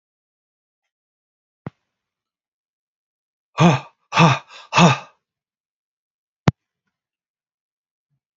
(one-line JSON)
{"exhalation_length": "8.4 s", "exhalation_amplitude": 32768, "exhalation_signal_mean_std_ratio": 0.23, "survey_phase": "beta (2021-08-13 to 2022-03-07)", "age": "65+", "gender": "Male", "wearing_mask": "No", "symptom_none": true, "smoker_status": "Ex-smoker", "respiratory_condition_asthma": false, "respiratory_condition_other": false, "recruitment_source": "REACT", "submission_delay": "5 days", "covid_test_result": "Negative", "covid_test_method": "RT-qPCR", "influenza_a_test_result": "Negative", "influenza_b_test_result": "Negative"}